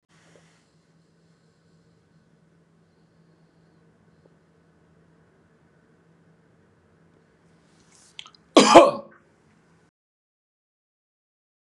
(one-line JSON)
{"cough_length": "11.8 s", "cough_amplitude": 32768, "cough_signal_mean_std_ratio": 0.14, "survey_phase": "beta (2021-08-13 to 2022-03-07)", "age": "18-44", "gender": "Male", "wearing_mask": "No", "symptom_none": true, "smoker_status": "Ex-smoker", "respiratory_condition_asthma": false, "respiratory_condition_other": false, "recruitment_source": "REACT", "submission_delay": "3 days", "covid_test_result": "Negative", "covid_test_method": "RT-qPCR", "influenza_a_test_result": "Unknown/Void", "influenza_b_test_result": "Unknown/Void"}